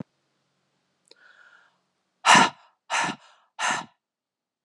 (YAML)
exhalation_length: 4.6 s
exhalation_amplitude: 25778
exhalation_signal_mean_std_ratio: 0.27
survey_phase: beta (2021-08-13 to 2022-03-07)
age: 45-64
gender: Female
wearing_mask: 'No'
symptom_cough_any: true
symptom_runny_or_blocked_nose: true
symptom_sore_throat: true
symptom_fatigue: true
symptom_onset: 6 days
smoker_status: Never smoked
respiratory_condition_asthma: false
respiratory_condition_other: false
recruitment_source: Test and Trace
submission_delay: 2 days
covid_test_result: Positive
covid_test_method: RT-qPCR
covid_ct_value: 15.9
covid_ct_gene: ORF1ab gene
covid_ct_mean: 16.2
covid_viral_load: 4800000 copies/ml
covid_viral_load_category: High viral load (>1M copies/ml)